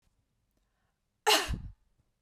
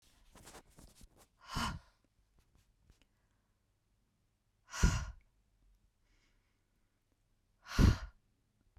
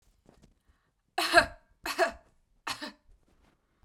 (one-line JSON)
{"cough_length": "2.2 s", "cough_amplitude": 9346, "cough_signal_mean_std_ratio": 0.29, "exhalation_length": "8.8 s", "exhalation_amplitude": 5819, "exhalation_signal_mean_std_ratio": 0.22, "three_cough_length": "3.8 s", "three_cough_amplitude": 19847, "three_cough_signal_mean_std_ratio": 0.27, "survey_phase": "beta (2021-08-13 to 2022-03-07)", "age": "18-44", "gender": "Female", "wearing_mask": "No", "symptom_none": true, "smoker_status": "Ex-smoker", "respiratory_condition_asthma": false, "respiratory_condition_other": false, "recruitment_source": "REACT", "submission_delay": "1 day", "covid_test_result": "Negative", "covid_test_method": "RT-qPCR"}